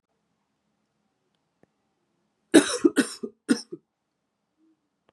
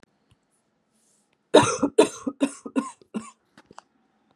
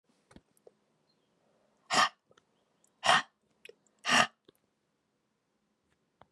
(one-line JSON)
{"cough_length": "5.1 s", "cough_amplitude": 26649, "cough_signal_mean_std_ratio": 0.2, "three_cough_length": "4.4 s", "three_cough_amplitude": 30344, "three_cough_signal_mean_std_ratio": 0.27, "exhalation_length": "6.3 s", "exhalation_amplitude": 12484, "exhalation_signal_mean_std_ratio": 0.23, "survey_phase": "beta (2021-08-13 to 2022-03-07)", "age": "18-44", "gender": "Female", "wearing_mask": "No", "symptom_cough_any": true, "symptom_runny_or_blocked_nose": true, "symptom_shortness_of_breath": true, "symptom_fatigue": true, "symptom_change_to_sense_of_smell_or_taste": true, "symptom_onset": "3 days", "smoker_status": "Ex-smoker", "respiratory_condition_asthma": false, "respiratory_condition_other": false, "recruitment_source": "Test and Trace", "submission_delay": "1 day", "covid_test_result": "Positive", "covid_test_method": "RT-qPCR", "covid_ct_value": 21.4, "covid_ct_gene": "ORF1ab gene", "covid_ct_mean": 21.7, "covid_viral_load": "75000 copies/ml", "covid_viral_load_category": "Low viral load (10K-1M copies/ml)"}